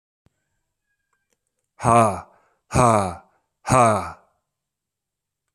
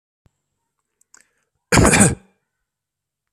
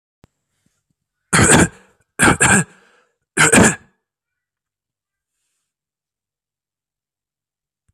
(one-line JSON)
{"exhalation_length": "5.5 s", "exhalation_amplitude": 28076, "exhalation_signal_mean_std_ratio": 0.34, "cough_length": "3.3 s", "cough_amplitude": 32767, "cough_signal_mean_std_ratio": 0.28, "three_cough_length": "7.9 s", "three_cough_amplitude": 32768, "three_cough_signal_mean_std_ratio": 0.3, "survey_phase": "alpha (2021-03-01 to 2021-08-12)", "age": "18-44", "gender": "Male", "wearing_mask": "No", "symptom_fatigue": true, "symptom_change_to_sense_of_smell_or_taste": true, "symptom_onset": "3 days", "smoker_status": "Ex-smoker", "respiratory_condition_asthma": false, "respiratory_condition_other": false, "recruitment_source": "Test and Trace", "submission_delay": "2 days", "covid_test_result": "Positive", "covid_test_method": "RT-qPCR", "covid_ct_value": 18.0, "covid_ct_gene": "N gene", "covid_ct_mean": 18.2, "covid_viral_load": "1100000 copies/ml", "covid_viral_load_category": "High viral load (>1M copies/ml)"}